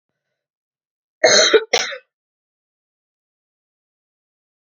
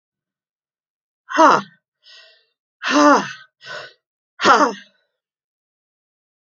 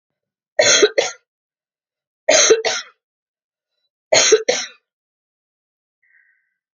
{
  "cough_length": "4.8 s",
  "cough_amplitude": 32768,
  "cough_signal_mean_std_ratio": 0.25,
  "exhalation_length": "6.6 s",
  "exhalation_amplitude": 30116,
  "exhalation_signal_mean_std_ratio": 0.31,
  "three_cough_length": "6.7 s",
  "three_cough_amplitude": 32166,
  "three_cough_signal_mean_std_ratio": 0.34,
  "survey_phase": "alpha (2021-03-01 to 2021-08-12)",
  "age": "65+",
  "gender": "Female",
  "wearing_mask": "No",
  "symptom_cough_any": true,
  "symptom_fatigue": true,
  "symptom_headache": true,
  "smoker_status": "Never smoked",
  "respiratory_condition_asthma": false,
  "respiratory_condition_other": false,
  "recruitment_source": "Test and Trace",
  "submission_delay": "2 days",
  "covid_test_result": "Positive",
  "covid_test_method": "RT-qPCR",
  "covid_ct_value": 28.5,
  "covid_ct_gene": "ORF1ab gene"
}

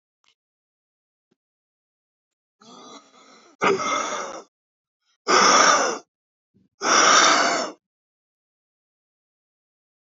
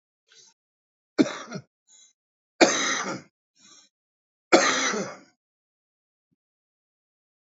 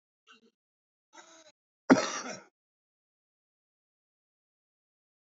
{
  "exhalation_length": "10.2 s",
  "exhalation_amplitude": 25129,
  "exhalation_signal_mean_std_ratio": 0.36,
  "three_cough_length": "7.6 s",
  "three_cough_amplitude": 28865,
  "three_cough_signal_mean_std_ratio": 0.28,
  "cough_length": "5.4 s",
  "cough_amplitude": 19834,
  "cough_signal_mean_std_ratio": 0.15,
  "survey_phase": "beta (2021-08-13 to 2022-03-07)",
  "age": "45-64",
  "gender": "Male",
  "wearing_mask": "No",
  "symptom_cough_any": true,
  "symptom_runny_or_blocked_nose": true,
  "smoker_status": "Current smoker (11 or more cigarettes per day)",
  "respiratory_condition_asthma": false,
  "respiratory_condition_other": false,
  "recruitment_source": "REACT",
  "submission_delay": "5 days",
  "covid_test_result": "Negative",
  "covid_test_method": "RT-qPCR"
}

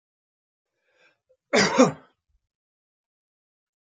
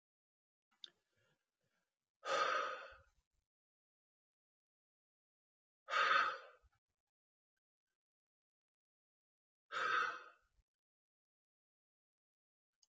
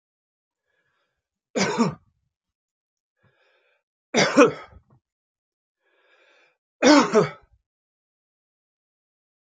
{
  "cough_length": "3.9 s",
  "cough_amplitude": 21005,
  "cough_signal_mean_std_ratio": 0.23,
  "exhalation_length": "12.9 s",
  "exhalation_amplitude": 2586,
  "exhalation_signal_mean_std_ratio": 0.27,
  "three_cough_length": "9.5 s",
  "three_cough_amplitude": 27246,
  "three_cough_signal_mean_std_ratio": 0.25,
  "survey_phase": "alpha (2021-03-01 to 2021-08-12)",
  "age": "45-64",
  "gender": "Male",
  "wearing_mask": "No",
  "symptom_cough_any": true,
  "symptom_fatigue": true,
  "symptom_fever_high_temperature": true,
  "symptom_onset": "6 days",
  "smoker_status": "Never smoked",
  "respiratory_condition_asthma": false,
  "respiratory_condition_other": false,
  "recruitment_source": "Test and Trace",
  "submission_delay": "1 day",
  "covid_test_result": "Positive",
  "covid_test_method": "RT-qPCR",
  "covid_ct_value": 15.6,
  "covid_ct_gene": "ORF1ab gene",
  "covid_ct_mean": 17.0,
  "covid_viral_load": "2700000 copies/ml",
  "covid_viral_load_category": "High viral load (>1M copies/ml)"
}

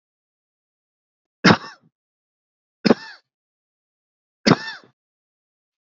{
  "three_cough_length": "5.8 s",
  "three_cough_amplitude": 30218,
  "three_cough_signal_mean_std_ratio": 0.18,
  "survey_phase": "beta (2021-08-13 to 2022-03-07)",
  "age": "45-64",
  "gender": "Male",
  "wearing_mask": "No",
  "symptom_none": true,
  "smoker_status": "Never smoked",
  "respiratory_condition_asthma": false,
  "respiratory_condition_other": false,
  "recruitment_source": "Test and Trace",
  "submission_delay": "0 days",
  "covid_test_result": "Negative",
  "covid_test_method": "LFT"
}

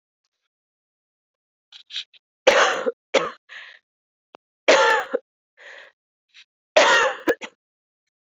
{
  "three_cough_length": "8.4 s",
  "three_cough_amplitude": 32767,
  "three_cough_signal_mean_std_ratio": 0.33,
  "survey_phase": "beta (2021-08-13 to 2022-03-07)",
  "age": "18-44",
  "gender": "Female",
  "wearing_mask": "No",
  "symptom_runny_or_blocked_nose": true,
  "symptom_sore_throat": true,
  "symptom_headache": true,
  "symptom_change_to_sense_of_smell_or_taste": true,
  "symptom_loss_of_taste": true,
  "smoker_status": "Never smoked",
  "respiratory_condition_asthma": false,
  "respiratory_condition_other": false,
  "recruitment_source": "Test and Trace",
  "submission_delay": "2 days",
  "covid_test_result": "Positive",
  "covid_test_method": "RT-qPCR",
  "covid_ct_value": 17.8,
  "covid_ct_gene": "N gene",
  "covid_ct_mean": 18.4,
  "covid_viral_load": "960000 copies/ml",
  "covid_viral_load_category": "Low viral load (10K-1M copies/ml)"
}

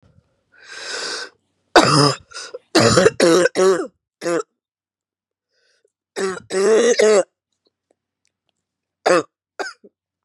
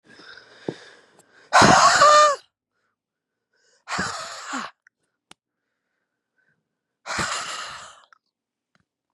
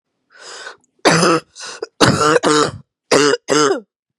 {
  "three_cough_length": "10.2 s",
  "three_cough_amplitude": 32768,
  "three_cough_signal_mean_std_ratio": 0.43,
  "exhalation_length": "9.1 s",
  "exhalation_amplitude": 28503,
  "exhalation_signal_mean_std_ratio": 0.31,
  "cough_length": "4.2 s",
  "cough_amplitude": 32768,
  "cough_signal_mean_std_ratio": 0.54,
  "survey_phase": "beta (2021-08-13 to 2022-03-07)",
  "age": "18-44",
  "gender": "Female",
  "wearing_mask": "No",
  "symptom_cough_any": true,
  "symptom_runny_or_blocked_nose": true,
  "symptom_shortness_of_breath": true,
  "symptom_sore_throat": true,
  "symptom_fatigue": true,
  "symptom_fever_high_temperature": true,
  "symptom_headache": true,
  "symptom_onset": "2 days",
  "smoker_status": "Never smoked",
  "respiratory_condition_asthma": true,
  "respiratory_condition_other": false,
  "recruitment_source": "Test and Trace",
  "submission_delay": "2 days",
  "covid_test_result": "Positive",
  "covid_test_method": "RT-qPCR",
  "covid_ct_value": 31.5,
  "covid_ct_gene": "N gene"
}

